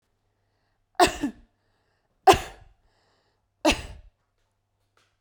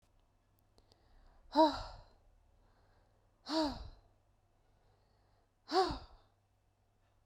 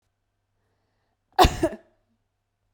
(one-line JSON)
{"three_cough_length": "5.2 s", "three_cough_amplitude": 31059, "three_cough_signal_mean_std_ratio": 0.22, "exhalation_length": "7.3 s", "exhalation_amplitude": 5230, "exhalation_signal_mean_std_ratio": 0.27, "cough_length": "2.7 s", "cough_amplitude": 27189, "cough_signal_mean_std_ratio": 0.21, "survey_phase": "beta (2021-08-13 to 2022-03-07)", "age": "18-44", "gender": "Female", "wearing_mask": "No", "symptom_none": true, "smoker_status": "Never smoked", "respiratory_condition_asthma": false, "respiratory_condition_other": false, "recruitment_source": "REACT", "submission_delay": "3 days", "covid_test_result": "Negative", "covid_test_method": "RT-qPCR"}